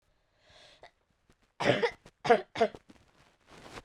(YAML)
three_cough_length: 3.8 s
three_cough_amplitude: 11097
three_cough_signal_mean_std_ratio: 0.29
survey_phase: beta (2021-08-13 to 2022-03-07)
age: 18-44
gender: Female
wearing_mask: 'No'
symptom_cough_any: true
symptom_runny_or_blocked_nose: true
symptom_shortness_of_breath: true
symptom_sore_throat: true
symptom_abdominal_pain: true
symptom_diarrhoea: true
symptom_fatigue: true
symptom_headache: true
smoker_status: Never smoked
respiratory_condition_asthma: false
respiratory_condition_other: false
recruitment_source: Test and Trace
submission_delay: 2 days
covid_test_result: Positive
covid_test_method: LFT